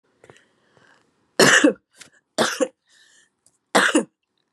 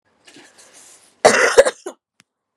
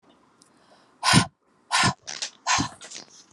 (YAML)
three_cough_length: 4.5 s
three_cough_amplitude: 30604
three_cough_signal_mean_std_ratio: 0.33
cough_length: 2.6 s
cough_amplitude: 32768
cough_signal_mean_std_ratio: 0.31
exhalation_length: 3.3 s
exhalation_amplitude: 24166
exhalation_signal_mean_std_ratio: 0.38
survey_phase: beta (2021-08-13 to 2022-03-07)
age: 45-64
gender: Female
wearing_mask: 'No'
symptom_none: true
symptom_onset: 12 days
smoker_status: Never smoked
respiratory_condition_asthma: false
respiratory_condition_other: false
recruitment_source: REACT
submission_delay: 1 day
covid_test_result: Negative
covid_test_method: RT-qPCR